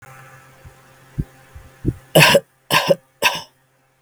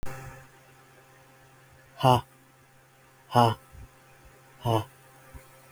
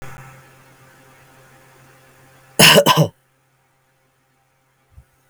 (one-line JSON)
{"three_cough_length": "4.0 s", "three_cough_amplitude": 32768, "three_cough_signal_mean_std_ratio": 0.34, "exhalation_length": "5.7 s", "exhalation_amplitude": 18779, "exhalation_signal_mean_std_ratio": 0.28, "cough_length": "5.3 s", "cough_amplitude": 32768, "cough_signal_mean_std_ratio": 0.26, "survey_phase": "beta (2021-08-13 to 2022-03-07)", "age": "18-44", "gender": "Male", "wearing_mask": "No", "symptom_none": true, "smoker_status": "Never smoked", "respiratory_condition_asthma": false, "respiratory_condition_other": false, "recruitment_source": "REACT", "submission_delay": "1 day", "covid_test_result": "Negative", "covid_test_method": "RT-qPCR"}